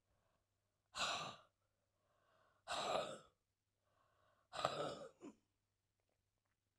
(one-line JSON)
{"exhalation_length": "6.8 s", "exhalation_amplitude": 3045, "exhalation_signal_mean_std_ratio": 0.36, "survey_phase": "alpha (2021-03-01 to 2021-08-12)", "age": "45-64", "gender": "Female", "wearing_mask": "No", "symptom_cough_any": true, "symptom_fatigue": true, "symptom_change_to_sense_of_smell_or_taste": true, "smoker_status": "Never smoked", "respiratory_condition_asthma": true, "respiratory_condition_other": false, "recruitment_source": "Test and Trace", "submission_delay": "1 day", "covid_test_result": "Positive", "covid_test_method": "RT-qPCR"}